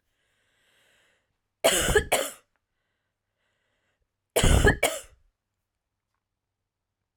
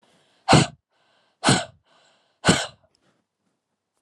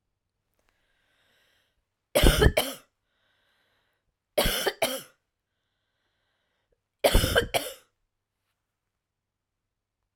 {"cough_length": "7.2 s", "cough_amplitude": 16268, "cough_signal_mean_std_ratio": 0.29, "exhalation_length": "4.0 s", "exhalation_amplitude": 31364, "exhalation_signal_mean_std_ratio": 0.28, "three_cough_length": "10.2 s", "three_cough_amplitude": 19871, "three_cough_signal_mean_std_ratio": 0.27, "survey_phase": "alpha (2021-03-01 to 2021-08-12)", "age": "18-44", "gender": "Female", "wearing_mask": "No", "symptom_fatigue": true, "smoker_status": "Never smoked", "respiratory_condition_asthma": false, "respiratory_condition_other": false, "recruitment_source": "REACT", "submission_delay": "2 days", "covid_test_result": "Negative", "covid_test_method": "RT-qPCR"}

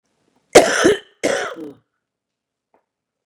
{"cough_length": "3.3 s", "cough_amplitude": 32768, "cough_signal_mean_std_ratio": 0.31, "survey_phase": "beta (2021-08-13 to 2022-03-07)", "age": "45-64", "gender": "Female", "wearing_mask": "No", "symptom_cough_any": true, "symptom_shortness_of_breath": true, "smoker_status": "Ex-smoker", "respiratory_condition_asthma": false, "respiratory_condition_other": true, "recruitment_source": "REACT", "submission_delay": "1 day", "covid_test_result": "Negative", "covid_test_method": "RT-qPCR", "influenza_a_test_result": "Negative", "influenza_b_test_result": "Negative"}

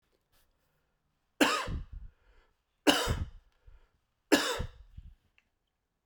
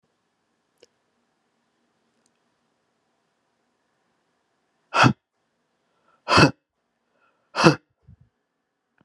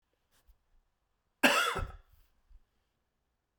{"three_cough_length": "6.1 s", "three_cough_amplitude": 15639, "three_cough_signal_mean_std_ratio": 0.32, "exhalation_length": "9.0 s", "exhalation_amplitude": 32737, "exhalation_signal_mean_std_ratio": 0.18, "cough_length": "3.6 s", "cough_amplitude": 15680, "cough_signal_mean_std_ratio": 0.26, "survey_phase": "alpha (2021-03-01 to 2021-08-12)", "age": "45-64", "gender": "Male", "wearing_mask": "No", "symptom_new_continuous_cough": true, "symptom_fatigue": true, "symptom_headache": true, "smoker_status": "Never smoked", "respiratory_condition_asthma": false, "respiratory_condition_other": false, "recruitment_source": "Test and Trace", "submission_delay": "2 days", "covid_test_result": "Positive", "covid_test_method": "RT-qPCR", "covid_ct_value": 17.6, "covid_ct_gene": "ORF1ab gene", "covid_ct_mean": 18.2, "covid_viral_load": "1100000 copies/ml", "covid_viral_load_category": "High viral load (>1M copies/ml)"}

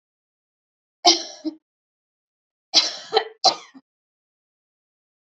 {"three_cough_length": "5.2 s", "three_cough_amplitude": 32768, "three_cough_signal_mean_std_ratio": 0.25, "survey_phase": "beta (2021-08-13 to 2022-03-07)", "age": "45-64", "gender": "Female", "wearing_mask": "No", "symptom_none": true, "smoker_status": "Never smoked", "respiratory_condition_asthma": false, "respiratory_condition_other": false, "recruitment_source": "REACT", "submission_delay": "1 day", "covid_test_result": "Negative", "covid_test_method": "RT-qPCR", "influenza_a_test_result": "Negative", "influenza_b_test_result": "Negative"}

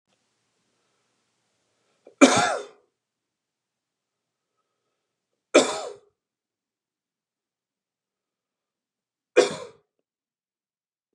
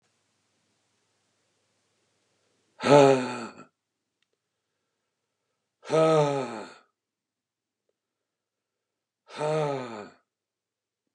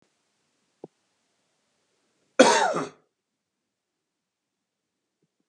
{"three_cough_length": "11.1 s", "three_cough_amplitude": 31947, "three_cough_signal_mean_std_ratio": 0.18, "exhalation_length": "11.1 s", "exhalation_amplitude": 20511, "exhalation_signal_mean_std_ratio": 0.27, "cough_length": "5.5 s", "cough_amplitude": 30607, "cough_signal_mean_std_ratio": 0.2, "survey_phase": "beta (2021-08-13 to 2022-03-07)", "age": "45-64", "gender": "Male", "wearing_mask": "No", "symptom_none": true, "symptom_onset": "8 days", "smoker_status": "Never smoked", "respiratory_condition_asthma": false, "respiratory_condition_other": false, "recruitment_source": "REACT", "submission_delay": "2 days", "covid_test_result": "Negative", "covid_test_method": "RT-qPCR", "influenza_a_test_result": "Negative", "influenza_b_test_result": "Negative"}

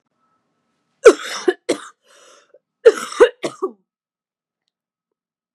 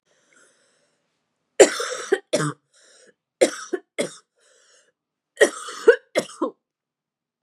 {"cough_length": "5.5 s", "cough_amplitude": 32768, "cough_signal_mean_std_ratio": 0.22, "three_cough_length": "7.4 s", "three_cough_amplitude": 32768, "three_cough_signal_mean_std_ratio": 0.26, "survey_phase": "beta (2021-08-13 to 2022-03-07)", "age": "18-44", "gender": "Female", "wearing_mask": "No", "symptom_cough_any": true, "symptom_runny_or_blocked_nose": true, "symptom_shortness_of_breath": true, "symptom_headache": true, "symptom_change_to_sense_of_smell_or_taste": true, "symptom_onset": "2 days", "smoker_status": "Never smoked", "respiratory_condition_asthma": false, "respiratory_condition_other": false, "recruitment_source": "Test and Trace", "submission_delay": "1 day", "covid_test_result": "Positive", "covid_test_method": "ePCR"}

